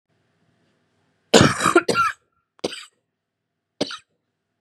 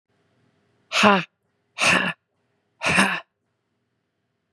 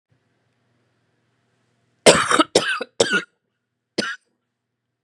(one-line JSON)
{"cough_length": "4.6 s", "cough_amplitude": 32768, "cough_signal_mean_std_ratio": 0.29, "exhalation_length": "4.5 s", "exhalation_amplitude": 32674, "exhalation_signal_mean_std_ratio": 0.35, "three_cough_length": "5.0 s", "three_cough_amplitude": 32768, "three_cough_signal_mean_std_ratio": 0.29, "survey_phase": "beta (2021-08-13 to 2022-03-07)", "age": "18-44", "gender": "Female", "wearing_mask": "No", "symptom_cough_any": true, "symptom_fatigue": true, "symptom_onset": "6 days", "smoker_status": "Never smoked", "respiratory_condition_asthma": false, "respiratory_condition_other": false, "recruitment_source": "REACT", "submission_delay": "1 day", "covid_test_result": "Negative", "covid_test_method": "RT-qPCR"}